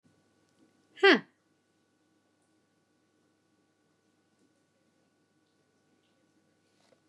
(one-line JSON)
{"exhalation_length": "7.1 s", "exhalation_amplitude": 15401, "exhalation_signal_mean_std_ratio": 0.12, "survey_phase": "beta (2021-08-13 to 2022-03-07)", "age": "45-64", "gender": "Female", "wearing_mask": "No", "symptom_none": true, "smoker_status": "Never smoked", "respiratory_condition_asthma": false, "respiratory_condition_other": false, "recruitment_source": "REACT", "submission_delay": "0 days", "covid_test_result": "Negative", "covid_test_method": "RT-qPCR", "influenza_a_test_result": "Negative", "influenza_b_test_result": "Negative"}